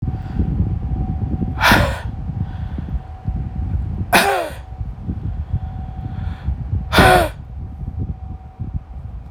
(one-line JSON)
{"exhalation_length": "9.3 s", "exhalation_amplitude": 30011, "exhalation_signal_mean_std_ratio": 0.75, "survey_phase": "alpha (2021-03-01 to 2021-08-12)", "age": "18-44", "gender": "Male", "wearing_mask": "No", "symptom_none": true, "smoker_status": "Never smoked", "respiratory_condition_asthma": false, "respiratory_condition_other": false, "recruitment_source": "REACT", "submission_delay": "1 day", "covid_test_result": "Negative", "covid_test_method": "RT-qPCR"}